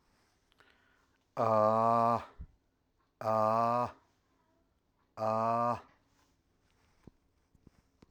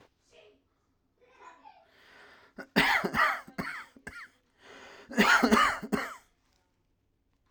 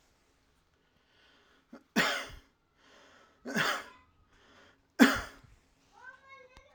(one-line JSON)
{"exhalation_length": "8.1 s", "exhalation_amplitude": 5626, "exhalation_signal_mean_std_ratio": 0.4, "cough_length": "7.5 s", "cough_amplitude": 14092, "cough_signal_mean_std_ratio": 0.37, "three_cough_length": "6.7 s", "three_cough_amplitude": 15423, "three_cough_signal_mean_std_ratio": 0.26, "survey_phase": "alpha (2021-03-01 to 2021-08-12)", "age": "18-44", "gender": "Male", "wearing_mask": "No", "symptom_none": true, "smoker_status": "Never smoked", "respiratory_condition_asthma": false, "respiratory_condition_other": false, "recruitment_source": "REACT", "submission_delay": "2 days", "covid_test_result": "Negative", "covid_test_method": "RT-qPCR"}